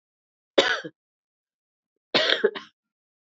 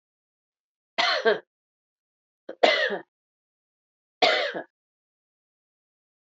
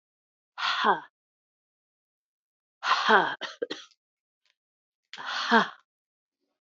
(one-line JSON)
{"cough_length": "3.2 s", "cough_amplitude": 25803, "cough_signal_mean_std_ratio": 0.31, "three_cough_length": "6.2 s", "three_cough_amplitude": 25424, "three_cough_signal_mean_std_ratio": 0.31, "exhalation_length": "6.7 s", "exhalation_amplitude": 16373, "exhalation_signal_mean_std_ratio": 0.33, "survey_phase": "beta (2021-08-13 to 2022-03-07)", "age": "65+", "gender": "Female", "wearing_mask": "No", "symptom_cough_any": true, "symptom_runny_or_blocked_nose": true, "symptom_shortness_of_breath": true, "symptom_fatigue": true, "symptom_fever_high_temperature": true, "symptom_headache": true, "symptom_change_to_sense_of_smell_or_taste": true, "symptom_loss_of_taste": true, "symptom_onset": "4 days", "smoker_status": "Ex-smoker", "respiratory_condition_asthma": false, "respiratory_condition_other": false, "recruitment_source": "Test and Trace", "submission_delay": "3 days", "covid_test_result": "Positive", "covid_test_method": "RT-qPCR", "covid_ct_value": 25.2, "covid_ct_gene": "ORF1ab gene"}